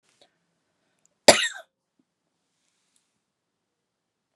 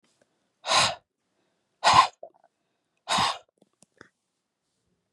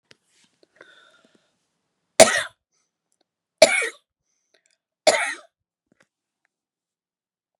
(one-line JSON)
{"cough_length": "4.4 s", "cough_amplitude": 32768, "cough_signal_mean_std_ratio": 0.13, "exhalation_length": "5.1 s", "exhalation_amplitude": 21552, "exhalation_signal_mean_std_ratio": 0.29, "three_cough_length": "7.6 s", "three_cough_amplitude": 32768, "three_cough_signal_mean_std_ratio": 0.19, "survey_phase": "beta (2021-08-13 to 2022-03-07)", "age": "45-64", "gender": "Female", "wearing_mask": "No", "symptom_none": true, "smoker_status": "Never smoked", "respiratory_condition_asthma": false, "respiratory_condition_other": false, "recruitment_source": "REACT", "submission_delay": "2 days", "covid_test_result": "Negative", "covid_test_method": "RT-qPCR"}